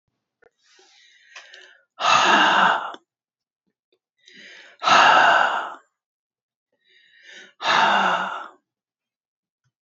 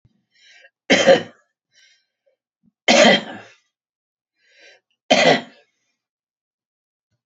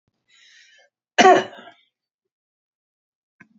exhalation_length: 9.8 s
exhalation_amplitude: 26301
exhalation_signal_mean_std_ratio: 0.41
three_cough_length: 7.3 s
three_cough_amplitude: 30070
three_cough_signal_mean_std_ratio: 0.29
cough_length: 3.6 s
cough_amplitude: 28056
cough_signal_mean_std_ratio: 0.21
survey_phase: beta (2021-08-13 to 2022-03-07)
age: 65+
gender: Male
wearing_mask: 'No'
symptom_none: true
smoker_status: Ex-smoker
respiratory_condition_asthma: false
respiratory_condition_other: false
recruitment_source: REACT
submission_delay: 2 days
covid_test_result: Negative
covid_test_method: RT-qPCR
influenza_a_test_result: Negative
influenza_b_test_result: Negative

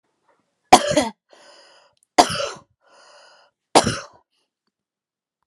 three_cough_length: 5.5 s
three_cough_amplitude: 32768
three_cough_signal_mean_std_ratio: 0.24
survey_phase: alpha (2021-03-01 to 2021-08-12)
age: 45-64
gender: Female
wearing_mask: 'No'
symptom_fatigue: true
symptom_onset: 11 days
smoker_status: Never smoked
respiratory_condition_asthma: false
respiratory_condition_other: false
recruitment_source: REACT
submission_delay: 2 days
covid_test_result: Negative
covid_test_method: RT-qPCR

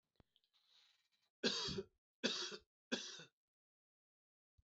three_cough_length: 4.7 s
three_cough_amplitude: 2248
three_cough_signal_mean_std_ratio: 0.34
survey_phase: beta (2021-08-13 to 2022-03-07)
age: 45-64
gender: Male
wearing_mask: 'No'
symptom_runny_or_blocked_nose: true
symptom_sore_throat: true
symptom_headache: true
symptom_onset: 3 days
smoker_status: Ex-smoker
respiratory_condition_asthma: false
respiratory_condition_other: false
recruitment_source: Test and Trace
submission_delay: 2 days
covid_test_result: Positive
covid_test_method: RT-qPCR
covid_ct_value: 20.0
covid_ct_gene: N gene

